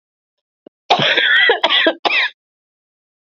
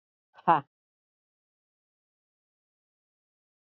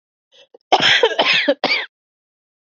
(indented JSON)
{
  "three_cough_length": "3.2 s",
  "three_cough_amplitude": 32344,
  "three_cough_signal_mean_std_ratio": 0.52,
  "exhalation_length": "3.8 s",
  "exhalation_amplitude": 13802,
  "exhalation_signal_mean_std_ratio": 0.12,
  "cough_length": "2.7 s",
  "cough_amplitude": 27768,
  "cough_signal_mean_std_ratio": 0.47,
  "survey_phase": "beta (2021-08-13 to 2022-03-07)",
  "age": "45-64",
  "gender": "Female",
  "wearing_mask": "No",
  "symptom_cough_any": true,
  "symptom_new_continuous_cough": true,
  "symptom_runny_or_blocked_nose": true,
  "symptom_shortness_of_breath": true,
  "symptom_sore_throat": true,
  "symptom_fatigue": true,
  "symptom_headache": true,
  "symptom_change_to_sense_of_smell_or_taste": true,
  "symptom_loss_of_taste": true,
  "symptom_onset": "3 days",
  "smoker_status": "Ex-smoker",
  "respiratory_condition_asthma": false,
  "respiratory_condition_other": false,
  "recruitment_source": "Test and Trace",
  "submission_delay": "2 days",
  "covid_test_result": "Positive",
  "covid_test_method": "RT-qPCR",
  "covid_ct_value": 17.0,
  "covid_ct_gene": "ORF1ab gene",
  "covid_ct_mean": 17.5,
  "covid_viral_load": "1900000 copies/ml",
  "covid_viral_load_category": "High viral load (>1M copies/ml)"
}